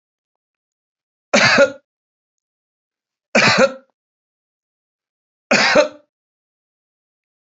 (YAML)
three_cough_length: 7.5 s
three_cough_amplitude: 32212
three_cough_signal_mean_std_ratio: 0.31
survey_phase: beta (2021-08-13 to 2022-03-07)
age: 65+
gender: Male
wearing_mask: 'No'
symptom_runny_or_blocked_nose: true
smoker_status: Never smoked
respiratory_condition_asthma: false
respiratory_condition_other: false
recruitment_source: REACT
submission_delay: 3 days
covid_test_result: Negative
covid_test_method: RT-qPCR
influenza_a_test_result: Negative
influenza_b_test_result: Negative